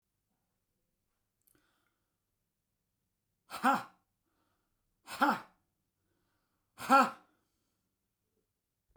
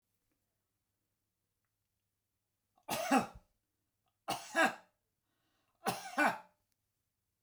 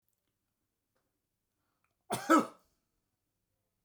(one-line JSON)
{"exhalation_length": "9.0 s", "exhalation_amplitude": 7831, "exhalation_signal_mean_std_ratio": 0.2, "three_cough_length": "7.4 s", "three_cough_amplitude": 4888, "three_cough_signal_mean_std_ratio": 0.28, "cough_length": "3.8 s", "cough_amplitude": 7950, "cough_signal_mean_std_ratio": 0.19, "survey_phase": "beta (2021-08-13 to 2022-03-07)", "age": "65+", "gender": "Male", "wearing_mask": "No", "symptom_runny_or_blocked_nose": true, "smoker_status": "Ex-smoker", "respiratory_condition_asthma": false, "respiratory_condition_other": false, "recruitment_source": "REACT", "submission_delay": "2 days", "covid_test_result": "Negative", "covid_test_method": "RT-qPCR"}